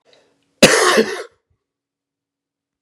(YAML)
cough_length: 2.8 s
cough_amplitude: 32768
cough_signal_mean_std_ratio: 0.32
survey_phase: beta (2021-08-13 to 2022-03-07)
age: 65+
gender: Male
wearing_mask: 'No'
symptom_cough_any: true
symptom_runny_or_blocked_nose: true
symptom_diarrhoea: true
symptom_fatigue: true
symptom_fever_high_temperature: true
symptom_change_to_sense_of_smell_or_taste: true
symptom_loss_of_taste: true
symptom_onset: 8 days
smoker_status: Never smoked
respiratory_condition_asthma: false
respiratory_condition_other: false
recruitment_source: Test and Trace
submission_delay: 3 days
covid_test_result: Positive
covid_test_method: RT-qPCR